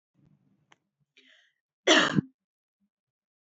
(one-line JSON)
{"cough_length": "3.4 s", "cough_amplitude": 15811, "cough_signal_mean_std_ratio": 0.23, "survey_phase": "beta (2021-08-13 to 2022-03-07)", "age": "45-64", "gender": "Female", "wearing_mask": "No", "symptom_none": true, "smoker_status": "Never smoked", "respiratory_condition_asthma": false, "respiratory_condition_other": false, "recruitment_source": "REACT", "submission_delay": "3 days", "covid_test_result": "Negative", "covid_test_method": "RT-qPCR", "influenza_a_test_result": "Negative", "influenza_b_test_result": "Negative"}